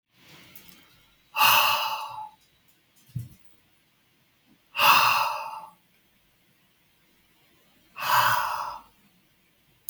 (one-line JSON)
{"exhalation_length": "9.9 s", "exhalation_amplitude": 18965, "exhalation_signal_mean_std_ratio": 0.38, "survey_phase": "beta (2021-08-13 to 2022-03-07)", "age": "18-44", "gender": "Male", "wearing_mask": "No", "symptom_none": true, "symptom_onset": "7 days", "smoker_status": "Ex-smoker", "respiratory_condition_asthma": true, "respiratory_condition_other": false, "recruitment_source": "REACT", "submission_delay": "2 days", "covid_test_result": "Negative", "covid_test_method": "RT-qPCR", "influenza_a_test_result": "Negative", "influenza_b_test_result": "Negative"}